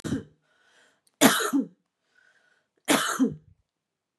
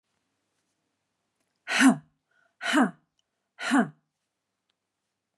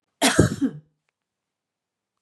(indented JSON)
{
  "three_cough_length": "4.2 s",
  "three_cough_amplitude": 30129,
  "three_cough_signal_mean_std_ratio": 0.36,
  "exhalation_length": "5.4 s",
  "exhalation_amplitude": 14039,
  "exhalation_signal_mean_std_ratio": 0.29,
  "cough_length": "2.2 s",
  "cough_amplitude": 25924,
  "cough_signal_mean_std_ratio": 0.32,
  "survey_phase": "beta (2021-08-13 to 2022-03-07)",
  "age": "45-64",
  "gender": "Female",
  "wearing_mask": "No",
  "symptom_none": true,
  "smoker_status": "Ex-smoker",
  "respiratory_condition_asthma": false,
  "respiratory_condition_other": false,
  "recruitment_source": "REACT",
  "submission_delay": "1 day",
  "covid_test_result": "Negative",
  "covid_test_method": "RT-qPCR",
  "influenza_a_test_result": "Negative",
  "influenza_b_test_result": "Negative"
}